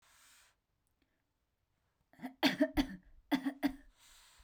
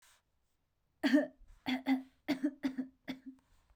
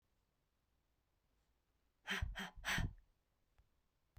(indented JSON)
{
  "cough_length": "4.4 s",
  "cough_amplitude": 4391,
  "cough_signal_mean_std_ratio": 0.31,
  "three_cough_length": "3.8 s",
  "three_cough_amplitude": 4489,
  "three_cough_signal_mean_std_ratio": 0.4,
  "exhalation_length": "4.2 s",
  "exhalation_amplitude": 1353,
  "exhalation_signal_mean_std_ratio": 0.33,
  "survey_phase": "beta (2021-08-13 to 2022-03-07)",
  "age": "45-64",
  "gender": "Female",
  "wearing_mask": "No",
  "symptom_none": true,
  "smoker_status": "Never smoked",
  "respiratory_condition_asthma": false,
  "respiratory_condition_other": false,
  "recruitment_source": "REACT",
  "submission_delay": "1 day",
  "covid_test_result": "Negative",
  "covid_test_method": "RT-qPCR"
}